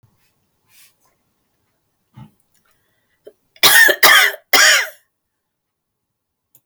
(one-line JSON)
{"three_cough_length": "6.7 s", "three_cough_amplitude": 32768, "three_cough_signal_mean_std_ratio": 0.31, "survey_phase": "beta (2021-08-13 to 2022-03-07)", "age": "65+", "gender": "Female", "wearing_mask": "No", "symptom_cough_any": true, "smoker_status": "Never smoked", "respiratory_condition_asthma": false, "respiratory_condition_other": false, "recruitment_source": "REACT", "submission_delay": "3 days", "covid_test_result": "Negative", "covid_test_method": "RT-qPCR"}